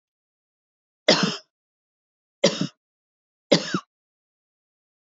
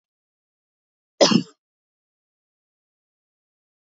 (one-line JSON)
{"three_cough_length": "5.1 s", "three_cough_amplitude": 25447, "three_cough_signal_mean_std_ratio": 0.25, "cough_length": "3.8 s", "cough_amplitude": 25673, "cough_signal_mean_std_ratio": 0.17, "survey_phase": "beta (2021-08-13 to 2022-03-07)", "age": "65+", "gender": "Female", "wearing_mask": "No", "symptom_none": true, "smoker_status": "Never smoked", "respiratory_condition_asthma": false, "respiratory_condition_other": false, "recruitment_source": "REACT", "submission_delay": "2 days", "covid_test_result": "Negative", "covid_test_method": "RT-qPCR", "influenza_a_test_result": "Negative", "influenza_b_test_result": "Negative"}